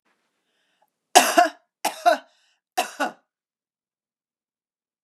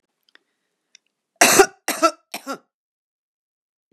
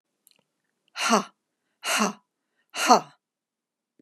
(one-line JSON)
{"three_cough_length": "5.0 s", "three_cough_amplitude": 32768, "three_cough_signal_mean_std_ratio": 0.26, "cough_length": "3.9 s", "cough_amplitude": 32768, "cough_signal_mean_std_ratio": 0.25, "exhalation_length": "4.0 s", "exhalation_amplitude": 28122, "exhalation_signal_mean_std_ratio": 0.3, "survey_phase": "beta (2021-08-13 to 2022-03-07)", "age": "45-64", "gender": "Female", "wearing_mask": "No", "symptom_none": true, "smoker_status": "Never smoked", "respiratory_condition_asthma": false, "respiratory_condition_other": false, "recruitment_source": "REACT", "submission_delay": "3 days", "covid_test_result": "Negative", "covid_test_method": "RT-qPCR", "influenza_a_test_result": "Negative", "influenza_b_test_result": "Negative"}